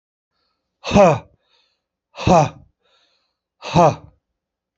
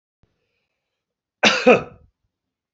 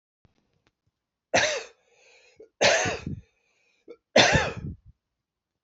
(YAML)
exhalation_length: 4.8 s
exhalation_amplitude: 32768
exhalation_signal_mean_std_ratio: 0.32
cough_length: 2.7 s
cough_amplitude: 27798
cough_signal_mean_std_ratio: 0.26
three_cough_length: 5.6 s
three_cough_amplitude: 26358
three_cough_signal_mean_std_ratio: 0.34
survey_phase: beta (2021-08-13 to 2022-03-07)
age: 45-64
gender: Male
wearing_mask: 'No'
symptom_cough_any: true
symptom_sore_throat: true
symptom_fatigue: true
symptom_headache: true
symptom_onset: 3 days
smoker_status: Never smoked
respiratory_condition_asthma: false
respiratory_condition_other: false
recruitment_source: Test and Trace
submission_delay: 2 days
covid_test_result: Positive
covid_test_method: RT-qPCR